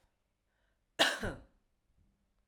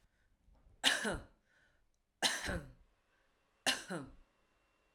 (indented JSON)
{
  "cough_length": "2.5 s",
  "cough_amplitude": 7639,
  "cough_signal_mean_std_ratio": 0.26,
  "three_cough_length": "4.9 s",
  "three_cough_amplitude": 6034,
  "three_cough_signal_mean_std_ratio": 0.35,
  "survey_phase": "alpha (2021-03-01 to 2021-08-12)",
  "age": "45-64",
  "gender": "Female",
  "wearing_mask": "No",
  "symptom_none": true,
  "smoker_status": "Current smoker (1 to 10 cigarettes per day)",
  "respiratory_condition_asthma": false,
  "respiratory_condition_other": false,
  "recruitment_source": "REACT",
  "submission_delay": "1 day",
  "covid_test_result": "Negative",
  "covid_test_method": "RT-qPCR"
}